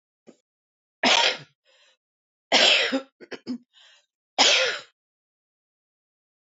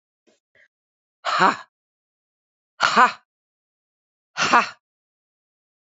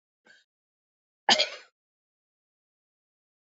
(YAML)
three_cough_length: 6.5 s
three_cough_amplitude: 20236
three_cough_signal_mean_std_ratio: 0.35
exhalation_length: 5.9 s
exhalation_amplitude: 28171
exhalation_signal_mean_std_ratio: 0.26
cough_length: 3.6 s
cough_amplitude: 16561
cough_signal_mean_std_ratio: 0.17
survey_phase: beta (2021-08-13 to 2022-03-07)
age: 65+
gender: Female
wearing_mask: 'No'
symptom_cough_any: true
symptom_shortness_of_breath: true
symptom_sore_throat: true
symptom_fatigue: true
symptom_fever_high_temperature: true
symptom_change_to_sense_of_smell_or_taste: true
symptom_loss_of_taste: true
symptom_onset: 6 days
smoker_status: Never smoked
respiratory_condition_asthma: false
respiratory_condition_other: false
recruitment_source: Test and Trace
submission_delay: 2 days
covid_test_result: Positive
covid_test_method: RT-qPCR
covid_ct_value: 18.2
covid_ct_gene: ORF1ab gene
covid_ct_mean: 19.1
covid_viral_load: 560000 copies/ml
covid_viral_load_category: Low viral load (10K-1M copies/ml)